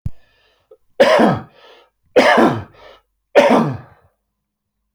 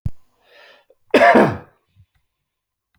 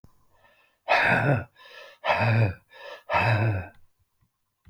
three_cough_length: 4.9 s
three_cough_amplitude: 32505
three_cough_signal_mean_std_ratio: 0.43
cough_length: 3.0 s
cough_amplitude: 27894
cough_signal_mean_std_ratio: 0.32
exhalation_length: 4.7 s
exhalation_amplitude: 12139
exhalation_signal_mean_std_ratio: 0.54
survey_phase: alpha (2021-03-01 to 2021-08-12)
age: 65+
gender: Male
wearing_mask: 'No'
symptom_none: true
smoker_status: Ex-smoker
respiratory_condition_asthma: false
respiratory_condition_other: false
recruitment_source: REACT
submission_delay: 2 days
covid_test_result: Negative
covid_test_method: RT-qPCR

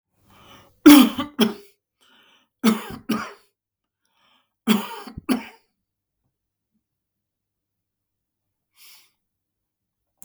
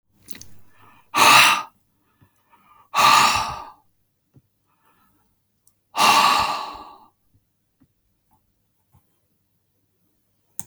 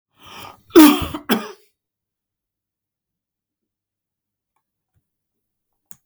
three_cough_length: 10.2 s
three_cough_amplitude: 32768
three_cough_signal_mean_std_ratio: 0.22
exhalation_length: 10.7 s
exhalation_amplitude: 32360
exhalation_signal_mean_std_ratio: 0.32
cough_length: 6.1 s
cough_amplitude: 32768
cough_signal_mean_std_ratio: 0.2
survey_phase: beta (2021-08-13 to 2022-03-07)
age: 65+
gender: Male
wearing_mask: 'No'
symptom_none: true
smoker_status: Ex-smoker
respiratory_condition_asthma: false
respiratory_condition_other: false
recruitment_source: REACT
submission_delay: 1 day
covid_test_result: Negative
covid_test_method: RT-qPCR
influenza_a_test_result: Unknown/Void
influenza_b_test_result: Unknown/Void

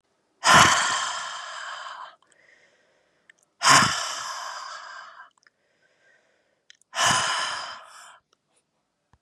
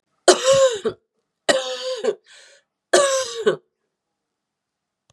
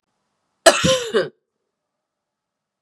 exhalation_length: 9.2 s
exhalation_amplitude: 27110
exhalation_signal_mean_std_ratio: 0.38
three_cough_length: 5.1 s
three_cough_amplitude: 32039
three_cough_signal_mean_std_ratio: 0.42
cough_length: 2.8 s
cough_amplitude: 32768
cough_signal_mean_std_ratio: 0.3
survey_phase: beta (2021-08-13 to 2022-03-07)
age: 45-64
gender: Female
wearing_mask: 'No'
symptom_cough_any: true
symptom_runny_or_blocked_nose: true
symptom_onset: 3 days
smoker_status: Never smoked
respiratory_condition_asthma: false
respiratory_condition_other: false
recruitment_source: Test and Trace
submission_delay: 2 days
covid_test_result: Positive
covid_test_method: RT-qPCR
covid_ct_value: 27.2
covid_ct_gene: ORF1ab gene
covid_ct_mean: 27.7
covid_viral_load: 810 copies/ml
covid_viral_load_category: Minimal viral load (< 10K copies/ml)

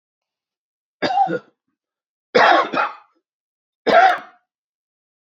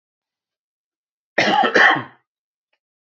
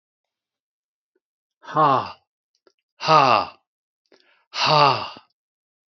three_cough_length: 5.3 s
three_cough_amplitude: 27448
three_cough_signal_mean_std_ratio: 0.37
cough_length: 3.1 s
cough_amplitude: 29673
cough_signal_mean_std_ratio: 0.35
exhalation_length: 6.0 s
exhalation_amplitude: 28818
exhalation_signal_mean_std_ratio: 0.34
survey_phase: beta (2021-08-13 to 2022-03-07)
age: 45-64
gender: Male
wearing_mask: 'No'
symptom_none: true
smoker_status: Never smoked
respiratory_condition_asthma: false
respiratory_condition_other: false
recruitment_source: REACT
submission_delay: 2 days
covid_test_result: Negative
covid_test_method: RT-qPCR
influenza_a_test_result: Negative
influenza_b_test_result: Negative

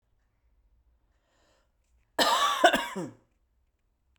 cough_length: 4.2 s
cough_amplitude: 16201
cough_signal_mean_std_ratio: 0.32
survey_phase: beta (2021-08-13 to 2022-03-07)
age: 45-64
gender: Female
wearing_mask: 'No'
symptom_cough_any: true
symptom_new_continuous_cough: true
symptom_runny_or_blocked_nose: true
symptom_shortness_of_breath: true
symptom_sore_throat: true
symptom_headache: true
symptom_onset: 2 days
smoker_status: Never smoked
respiratory_condition_asthma: false
respiratory_condition_other: false
recruitment_source: Test and Trace
submission_delay: 1 day
covid_test_result: Positive
covid_test_method: RT-qPCR
covid_ct_value: 25.5
covid_ct_gene: ORF1ab gene
covid_ct_mean: 26.5
covid_viral_load: 2100 copies/ml
covid_viral_load_category: Minimal viral load (< 10K copies/ml)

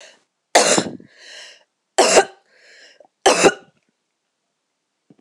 three_cough_length: 5.2 s
three_cough_amplitude: 26028
three_cough_signal_mean_std_ratio: 0.32
survey_phase: alpha (2021-03-01 to 2021-08-12)
age: 45-64
gender: Female
wearing_mask: 'No'
symptom_none: true
smoker_status: Ex-smoker
respiratory_condition_asthma: false
respiratory_condition_other: false
recruitment_source: REACT
submission_delay: 3 days
covid_test_result: Negative
covid_test_method: RT-qPCR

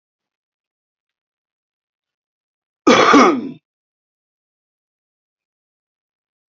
cough_length: 6.5 s
cough_amplitude: 30195
cough_signal_mean_std_ratio: 0.23
survey_phase: beta (2021-08-13 to 2022-03-07)
age: 65+
gender: Male
wearing_mask: 'No'
symptom_cough_any: true
smoker_status: Current smoker (1 to 10 cigarettes per day)
respiratory_condition_asthma: false
respiratory_condition_other: false
recruitment_source: REACT
submission_delay: 0 days
covid_test_result: Negative
covid_test_method: RT-qPCR
influenza_a_test_result: Negative
influenza_b_test_result: Negative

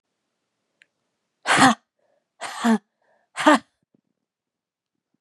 exhalation_length: 5.2 s
exhalation_amplitude: 29013
exhalation_signal_mean_std_ratio: 0.27
survey_phase: beta (2021-08-13 to 2022-03-07)
age: 18-44
gender: Female
wearing_mask: 'No'
symptom_cough_any: true
symptom_runny_or_blocked_nose: true
symptom_fatigue: true
symptom_headache: true
symptom_onset: 1 day
smoker_status: Ex-smoker
respiratory_condition_asthma: true
respiratory_condition_other: false
recruitment_source: Test and Trace
submission_delay: 1 day
covid_test_result: Positive
covid_test_method: RT-qPCR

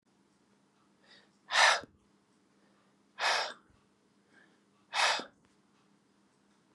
exhalation_length: 6.7 s
exhalation_amplitude: 9366
exhalation_signal_mean_std_ratio: 0.28
survey_phase: beta (2021-08-13 to 2022-03-07)
age: 18-44
gender: Male
wearing_mask: 'No'
symptom_none: true
smoker_status: Ex-smoker
respiratory_condition_asthma: false
respiratory_condition_other: false
recruitment_source: REACT
submission_delay: 2 days
covid_test_result: Negative
covid_test_method: RT-qPCR
influenza_a_test_result: Negative
influenza_b_test_result: Negative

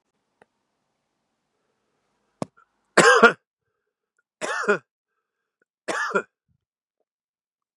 three_cough_length: 7.8 s
three_cough_amplitude: 32767
three_cough_signal_mean_std_ratio: 0.23
survey_phase: beta (2021-08-13 to 2022-03-07)
age: 45-64
gender: Male
wearing_mask: 'No'
symptom_runny_or_blocked_nose: true
symptom_abdominal_pain: true
symptom_fatigue: true
symptom_onset: 4 days
smoker_status: Never smoked
respiratory_condition_asthma: false
respiratory_condition_other: false
recruitment_source: Test and Trace
submission_delay: 1 day
covid_test_result: Positive
covid_test_method: RT-qPCR
covid_ct_value: 19.6
covid_ct_gene: ORF1ab gene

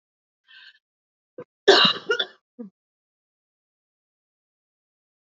cough_length: 5.2 s
cough_amplitude: 27540
cough_signal_mean_std_ratio: 0.21
survey_phase: alpha (2021-03-01 to 2021-08-12)
age: 45-64
gender: Female
wearing_mask: 'No'
symptom_cough_any: true
symptom_shortness_of_breath: true
symptom_headache: true
symptom_loss_of_taste: true
symptom_onset: 4 days
smoker_status: Never smoked
respiratory_condition_asthma: false
respiratory_condition_other: false
recruitment_source: Test and Trace
submission_delay: 1 day
covid_test_result: Positive
covid_test_method: RT-qPCR
covid_ct_value: 20.0
covid_ct_gene: ORF1ab gene
covid_ct_mean: 20.6
covid_viral_load: 170000 copies/ml
covid_viral_load_category: Low viral load (10K-1M copies/ml)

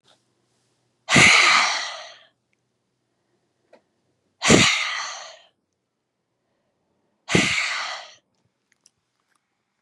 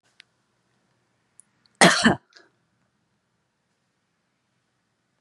exhalation_length: 9.8 s
exhalation_amplitude: 32591
exhalation_signal_mean_std_ratio: 0.34
cough_length: 5.2 s
cough_amplitude: 27255
cough_signal_mean_std_ratio: 0.18
survey_phase: beta (2021-08-13 to 2022-03-07)
age: 45-64
gender: Female
wearing_mask: 'No'
symptom_cough_any: true
symptom_onset: 3 days
smoker_status: Current smoker (1 to 10 cigarettes per day)
respiratory_condition_asthma: false
respiratory_condition_other: false
recruitment_source: Test and Trace
submission_delay: 1 day
covid_test_result: Positive
covid_test_method: RT-qPCR
covid_ct_value: 34.3
covid_ct_gene: ORF1ab gene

